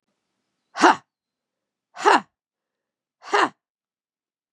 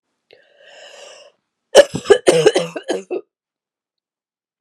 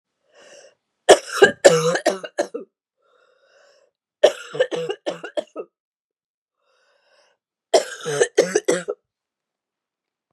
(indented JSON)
{
  "exhalation_length": "4.5 s",
  "exhalation_amplitude": 30684,
  "exhalation_signal_mean_std_ratio": 0.24,
  "cough_length": "4.6 s",
  "cough_amplitude": 32768,
  "cough_signal_mean_std_ratio": 0.29,
  "three_cough_length": "10.3 s",
  "three_cough_amplitude": 32768,
  "three_cough_signal_mean_std_ratio": 0.3,
  "survey_phase": "beta (2021-08-13 to 2022-03-07)",
  "age": "45-64",
  "gender": "Female",
  "wearing_mask": "No",
  "symptom_cough_any": true,
  "symptom_runny_or_blocked_nose": true,
  "symptom_diarrhoea": true,
  "symptom_fatigue": true,
  "symptom_headache": true,
  "symptom_other": true,
  "symptom_onset": "3 days",
  "smoker_status": "Prefer not to say",
  "respiratory_condition_asthma": false,
  "respiratory_condition_other": false,
  "recruitment_source": "Test and Trace",
  "submission_delay": "2 days",
  "covid_test_result": "Positive",
  "covid_test_method": "RT-qPCR"
}